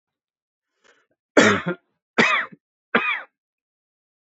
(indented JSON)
{
  "three_cough_length": "4.3 s",
  "three_cough_amplitude": 27975,
  "three_cough_signal_mean_std_ratio": 0.32,
  "survey_phase": "beta (2021-08-13 to 2022-03-07)",
  "age": "18-44",
  "gender": "Male",
  "wearing_mask": "No",
  "symptom_cough_any": true,
  "symptom_fatigue": true,
  "symptom_fever_high_temperature": true,
  "symptom_headache": true,
  "symptom_onset": "2 days",
  "smoker_status": "Never smoked",
  "respiratory_condition_asthma": false,
  "respiratory_condition_other": false,
  "recruitment_source": "Test and Trace",
  "submission_delay": "2 days",
  "covid_test_result": "Positive",
  "covid_test_method": "RT-qPCR"
}